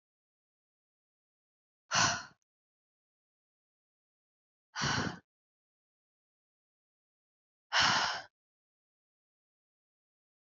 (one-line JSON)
{"exhalation_length": "10.4 s", "exhalation_amplitude": 6769, "exhalation_signal_mean_std_ratio": 0.25, "survey_phase": "beta (2021-08-13 to 2022-03-07)", "age": "18-44", "gender": "Female", "wearing_mask": "No", "symptom_runny_or_blocked_nose": true, "symptom_diarrhoea": true, "symptom_headache": true, "smoker_status": "Never smoked", "respiratory_condition_asthma": false, "respiratory_condition_other": false, "recruitment_source": "Test and Trace", "submission_delay": "2 days", "covid_test_result": "Positive", "covid_test_method": "RT-qPCR", "covid_ct_value": 28.3, "covid_ct_gene": "N gene", "covid_ct_mean": 29.2, "covid_viral_load": "270 copies/ml", "covid_viral_load_category": "Minimal viral load (< 10K copies/ml)"}